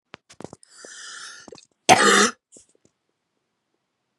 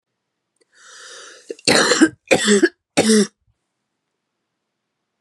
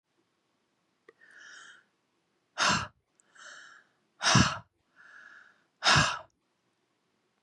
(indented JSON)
{
  "cough_length": "4.2 s",
  "cough_amplitude": 32768,
  "cough_signal_mean_std_ratio": 0.27,
  "three_cough_length": "5.2 s",
  "three_cough_amplitude": 32754,
  "three_cough_signal_mean_std_ratio": 0.37,
  "exhalation_length": "7.4 s",
  "exhalation_amplitude": 11699,
  "exhalation_signal_mean_std_ratio": 0.29,
  "survey_phase": "beta (2021-08-13 to 2022-03-07)",
  "age": "18-44",
  "gender": "Female",
  "wearing_mask": "No",
  "symptom_cough_any": true,
  "symptom_new_continuous_cough": true,
  "symptom_runny_or_blocked_nose": true,
  "symptom_sore_throat": true,
  "symptom_fatigue": true,
  "symptom_headache": true,
  "symptom_change_to_sense_of_smell_or_taste": true,
  "symptom_loss_of_taste": true,
  "symptom_other": true,
  "smoker_status": "Never smoked",
  "respiratory_condition_asthma": false,
  "respiratory_condition_other": false,
  "recruitment_source": "Test and Trace",
  "submission_delay": "2 days",
  "covid_test_result": "Positive",
  "covid_test_method": "RT-qPCR",
  "covid_ct_value": 19.7,
  "covid_ct_gene": "ORF1ab gene",
  "covid_ct_mean": 20.5,
  "covid_viral_load": "190000 copies/ml",
  "covid_viral_load_category": "Low viral load (10K-1M copies/ml)"
}